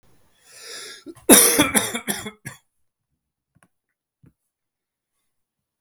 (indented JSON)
{
  "cough_length": "5.8 s",
  "cough_amplitude": 32768,
  "cough_signal_mean_std_ratio": 0.26,
  "survey_phase": "beta (2021-08-13 to 2022-03-07)",
  "age": "45-64",
  "gender": "Male",
  "wearing_mask": "No",
  "symptom_cough_any": true,
  "symptom_runny_or_blocked_nose": true,
  "symptom_fatigue": true,
  "symptom_headache": true,
  "symptom_change_to_sense_of_smell_or_taste": true,
  "symptom_onset": "3 days",
  "smoker_status": "Ex-smoker",
  "respiratory_condition_asthma": false,
  "respiratory_condition_other": false,
  "recruitment_source": "Test and Trace",
  "submission_delay": "2 days",
  "covid_test_result": "Positive",
  "covid_test_method": "RT-qPCR",
  "covid_ct_value": 17.9,
  "covid_ct_gene": "ORF1ab gene",
  "covid_ct_mean": 18.6,
  "covid_viral_load": "790000 copies/ml",
  "covid_viral_load_category": "Low viral load (10K-1M copies/ml)"
}